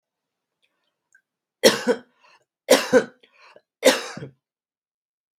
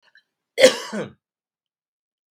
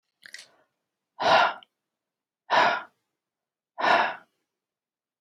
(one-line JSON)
{"three_cough_length": "5.4 s", "three_cough_amplitude": 32720, "three_cough_signal_mean_std_ratio": 0.26, "cough_length": "2.3 s", "cough_amplitude": 32767, "cough_signal_mean_std_ratio": 0.23, "exhalation_length": "5.2 s", "exhalation_amplitude": 13890, "exhalation_signal_mean_std_ratio": 0.35, "survey_phase": "beta (2021-08-13 to 2022-03-07)", "age": "45-64", "gender": "Male", "wearing_mask": "No", "symptom_none": true, "smoker_status": "Never smoked", "respiratory_condition_asthma": false, "respiratory_condition_other": false, "recruitment_source": "REACT", "submission_delay": "1 day", "covid_test_result": "Negative", "covid_test_method": "RT-qPCR", "influenza_a_test_result": "Negative", "influenza_b_test_result": "Negative"}